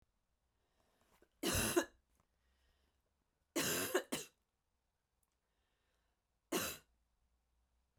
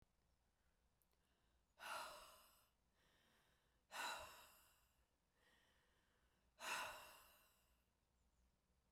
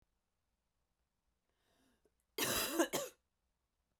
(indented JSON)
{
  "three_cough_length": "8.0 s",
  "three_cough_amplitude": 3325,
  "three_cough_signal_mean_std_ratio": 0.31,
  "exhalation_length": "8.9 s",
  "exhalation_amplitude": 590,
  "exhalation_signal_mean_std_ratio": 0.37,
  "cough_length": "4.0 s",
  "cough_amplitude": 3608,
  "cough_signal_mean_std_ratio": 0.31,
  "survey_phase": "beta (2021-08-13 to 2022-03-07)",
  "age": "18-44",
  "gender": "Female",
  "wearing_mask": "No",
  "symptom_cough_any": true,
  "symptom_runny_or_blocked_nose": true,
  "symptom_sore_throat": true,
  "symptom_fever_high_temperature": true,
  "smoker_status": "Never smoked",
  "respiratory_condition_asthma": false,
  "respiratory_condition_other": false,
  "recruitment_source": "Test and Trace",
  "submission_delay": "5 days",
  "covid_test_result": "Negative",
  "covid_test_method": "RT-qPCR"
}